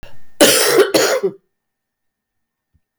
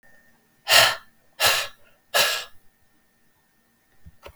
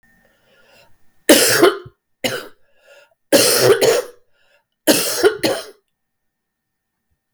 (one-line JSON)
{"cough_length": "3.0 s", "cough_amplitude": 32766, "cough_signal_mean_std_ratio": 0.48, "exhalation_length": "4.4 s", "exhalation_amplitude": 30372, "exhalation_signal_mean_std_ratio": 0.34, "three_cough_length": "7.3 s", "three_cough_amplitude": 32768, "three_cough_signal_mean_std_ratio": 0.41, "survey_phase": "beta (2021-08-13 to 2022-03-07)", "age": "65+", "gender": "Female", "wearing_mask": "No", "symptom_cough_any": true, "symptom_onset": "12 days", "smoker_status": "Never smoked", "respiratory_condition_asthma": false, "respiratory_condition_other": false, "recruitment_source": "REACT", "submission_delay": "2 days", "covid_test_result": "Negative", "covid_test_method": "RT-qPCR", "influenza_a_test_result": "Negative", "influenza_b_test_result": "Negative"}